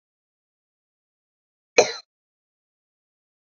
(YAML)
cough_length: 3.6 s
cough_amplitude: 28291
cough_signal_mean_std_ratio: 0.12
survey_phase: beta (2021-08-13 to 2022-03-07)
age: 18-44
gender: Female
wearing_mask: 'No'
symptom_none: true
smoker_status: Ex-smoker
respiratory_condition_asthma: false
respiratory_condition_other: false
recruitment_source: Test and Trace
submission_delay: 1 day
covid_test_result: Negative
covid_test_method: RT-qPCR